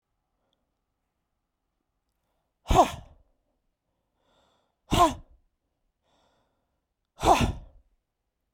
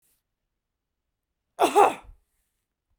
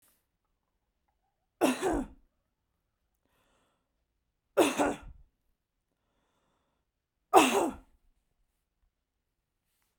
{"exhalation_length": "8.5 s", "exhalation_amplitude": 15793, "exhalation_signal_mean_std_ratio": 0.23, "cough_length": "3.0 s", "cough_amplitude": 18869, "cough_signal_mean_std_ratio": 0.24, "three_cough_length": "10.0 s", "three_cough_amplitude": 18596, "three_cough_signal_mean_std_ratio": 0.24, "survey_phase": "beta (2021-08-13 to 2022-03-07)", "age": "45-64", "gender": "Female", "wearing_mask": "No", "symptom_none": true, "smoker_status": "Never smoked", "respiratory_condition_asthma": false, "respiratory_condition_other": false, "recruitment_source": "REACT", "submission_delay": "2 days", "covid_test_result": "Negative", "covid_test_method": "RT-qPCR"}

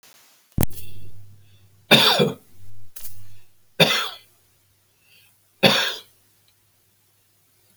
{"three_cough_length": "7.8 s", "three_cough_amplitude": 32768, "three_cough_signal_mean_std_ratio": 0.43, "survey_phase": "beta (2021-08-13 to 2022-03-07)", "age": "65+", "gender": "Male", "wearing_mask": "No", "symptom_none": true, "smoker_status": "Ex-smoker", "respiratory_condition_asthma": false, "respiratory_condition_other": false, "recruitment_source": "REACT", "submission_delay": "1 day", "covid_test_result": "Negative", "covid_test_method": "RT-qPCR"}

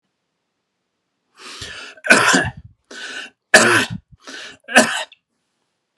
{"three_cough_length": "6.0 s", "three_cough_amplitude": 32768, "three_cough_signal_mean_std_ratio": 0.35, "survey_phase": "beta (2021-08-13 to 2022-03-07)", "age": "18-44", "gender": "Male", "wearing_mask": "No", "symptom_none": true, "smoker_status": "Never smoked", "respiratory_condition_asthma": false, "respiratory_condition_other": false, "recruitment_source": "REACT", "submission_delay": "3 days", "covid_test_result": "Negative", "covid_test_method": "RT-qPCR"}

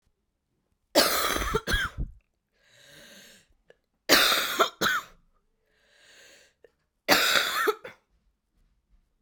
{"three_cough_length": "9.2 s", "three_cough_amplitude": 27198, "three_cough_signal_mean_std_ratio": 0.4, "survey_phase": "alpha (2021-03-01 to 2021-08-12)", "age": "18-44", "gender": "Female", "wearing_mask": "No", "symptom_cough_any": true, "symptom_shortness_of_breath": true, "symptom_fatigue": true, "symptom_change_to_sense_of_smell_or_taste": true, "symptom_loss_of_taste": true, "symptom_onset": "4 days", "smoker_status": "Current smoker (1 to 10 cigarettes per day)", "respiratory_condition_asthma": true, "respiratory_condition_other": false, "recruitment_source": "Test and Trace", "submission_delay": "1 day", "covid_test_result": "Positive", "covid_test_method": "RT-qPCR", "covid_ct_value": 23.0, "covid_ct_gene": "ORF1ab gene"}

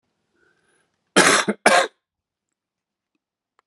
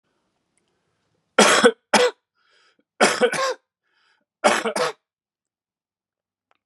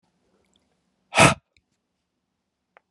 {"cough_length": "3.7 s", "cough_amplitude": 32767, "cough_signal_mean_std_ratio": 0.29, "three_cough_length": "6.7 s", "three_cough_amplitude": 31165, "three_cough_signal_mean_std_ratio": 0.34, "exhalation_length": "2.9 s", "exhalation_amplitude": 29386, "exhalation_signal_mean_std_ratio": 0.19, "survey_phase": "beta (2021-08-13 to 2022-03-07)", "age": "45-64", "gender": "Male", "wearing_mask": "No", "symptom_cough_any": true, "symptom_fatigue": true, "symptom_fever_high_temperature": true, "symptom_headache": true, "smoker_status": "Never smoked", "respiratory_condition_asthma": false, "respiratory_condition_other": false, "recruitment_source": "Test and Trace", "submission_delay": "2 days", "covid_test_result": "Positive", "covid_test_method": "RT-qPCR"}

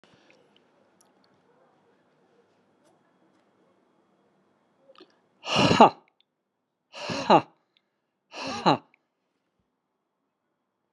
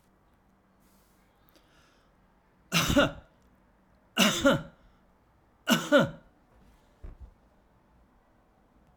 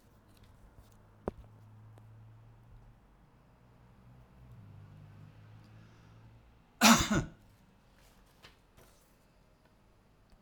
{"exhalation_length": "10.9 s", "exhalation_amplitude": 32178, "exhalation_signal_mean_std_ratio": 0.2, "three_cough_length": "9.0 s", "three_cough_amplitude": 11842, "three_cough_signal_mean_std_ratio": 0.29, "cough_length": "10.4 s", "cough_amplitude": 15518, "cough_signal_mean_std_ratio": 0.22, "survey_phase": "alpha (2021-03-01 to 2021-08-12)", "age": "45-64", "gender": "Male", "wearing_mask": "No", "symptom_none": true, "smoker_status": "Ex-smoker", "respiratory_condition_asthma": false, "respiratory_condition_other": false, "recruitment_source": "REACT", "submission_delay": "1 day", "covid_test_result": "Negative", "covid_test_method": "RT-qPCR"}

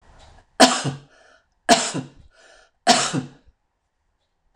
{"three_cough_length": "4.6 s", "three_cough_amplitude": 26028, "three_cough_signal_mean_std_ratio": 0.32, "survey_phase": "beta (2021-08-13 to 2022-03-07)", "age": "65+", "gender": "Female", "wearing_mask": "No", "symptom_none": true, "symptom_onset": "4 days", "smoker_status": "Never smoked", "respiratory_condition_asthma": false, "respiratory_condition_other": false, "recruitment_source": "REACT", "submission_delay": "2 days", "covid_test_result": "Negative", "covid_test_method": "RT-qPCR"}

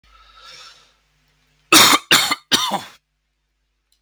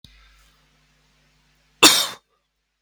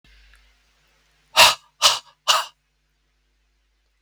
{"three_cough_length": "4.0 s", "three_cough_amplitude": 32768, "three_cough_signal_mean_std_ratio": 0.33, "cough_length": "2.8 s", "cough_amplitude": 32768, "cough_signal_mean_std_ratio": 0.22, "exhalation_length": "4.0 s", "exhalation_amplitude": 32768, "exhalation_signal_mean_std_ratio": 0.26, "survey_phase": "beta (2021-08-13 to 2022-03-07)", "age": "18-44", "gender": "Male", "wearing_mask": "No", "symptom_cough_any": true, "symptom_runny_or_blocked_nose": true, "symptom_other": true, "symptom_onset": "3 days", "smoker_status": "Current smoker (1 to 10 cigarettes per day)", "respiratory_condition_asthma": false, "respiratory_condition_other": false, "recruitment_source": "Test and Trace", "submission_delay": "1 day", "covid_test_result": "Positive", "covid_test_method": "RT-qPCR", "covid_ct_value": 22.6, "covid_ct_gene": "ORF1ab gene"}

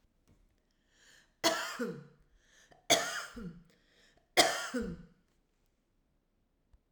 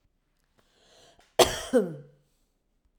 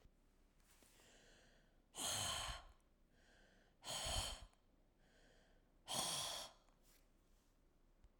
{"three_cough_length": "6.9 s", "three_cough_amplitude": 11306, "three_cough_signal_mean_std_ratio": 0.32, "cough_length": "3.0 s", "cough_amplitude": 25740, "cough_signal_mean_std_ratio": 0.25, "exhalation_length": "8.2 s", "exhalation_amplitude": 1293, "exhalation_signal_mean_std_ratio": 0.46, "survey_phase": "alpha (2021-03-01 to 2021-08-12)", "age": "65+", "gender": "Female", "wearing_mask": "No", "symptom_none": true, "smoker_status": "Ex-smoker", "respiratory_condition_asthma": false, "respiratory_condition_other": false, "recruitment_source": "REACT", "submission_delay": "1 day", "covid_test_result": "Negative", "covid_test_method": "RT-qPCR"}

